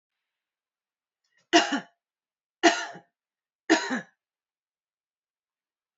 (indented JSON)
{
  "three_cough_length": "6.0 s",
  "three_cough_amplitude": 21241,
  "three_cough_signal_mean_std_ratio": 0.24,
  "survey_phase": "beta (2021-08-13 to 2022-03-07)",
  "age": "45-64",
  "gender": "Female",
  "wearing_mask": "No",
  "symptom_cough_any": true,
  "symptom_runny_or_blocked_nose": true,
  "symptom_fatigue": true,
  "symptom_headache": true,
  "symptom_other": true,
  "symptom_onset": "3 days",
  "smoker_status": "Ex-smoker",
  "respiratory_condition_asthma": false,
  "respiratory_condition_other": false,
  "recruitment_source": "Test and Trace",
  "submission_delay": "1 day",
  "covid_test_result": "Positive",
  "covid_test_method": "RT-qPCR",
  "covid_ct_value": 20.7,
  "covid_ct_gene": "N gene"
}